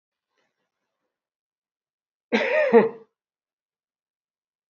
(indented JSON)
{
  "cough_length": "4.7 s",
  "cough_amplitude": 22075,
  "cough_signal_mean_std_ratio": 0.26,
  "survey_phase": "beta (2021-08-13 to 2022-03-07)",
  "age": "65+",
  "gender": "Male",
  "wearing_mask": "No",
  "symptom_none": true,
  "smoker_status": "Never smoked",
  "respiratory_condition_asthma": false,
  "respiratory_condition_other": false,
  "recruitment_source": "REACT",
  "submission_delay": "2 days",
  "covid_test_result": "Negative",
  "covid_test_method": "RT-qPCR"
}